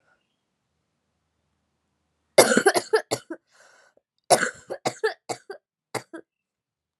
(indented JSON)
{
  "cough_length": "7.0 s",
  "cough_amplitude": 31453,
  "cough_signal_mean_std_ratio": 0.26,
  "survey_phase": "alpha (2021-03-01 to 2021-08-12)",
  "age": "18-44",
  "gender": "Female",
  "wearing_mask": "No",
  "symptom_cough_any": true,
  "symptom_new_continuous_cough": true,
  "symptom_fatigue": true,
  "symptom_headache": true,
  "symptom_onset": "3 days",
  "smoker_status": "Never smoked",
  "respiratory_condition_asthma": false,
  "respiratory_condition_other": false,
  "recruitment_source": "Test and Trace",
  "submission_delay": "2 days",
  "covid_test_result": "Positive",
  "covid_test_method": "RT-qPCR"
}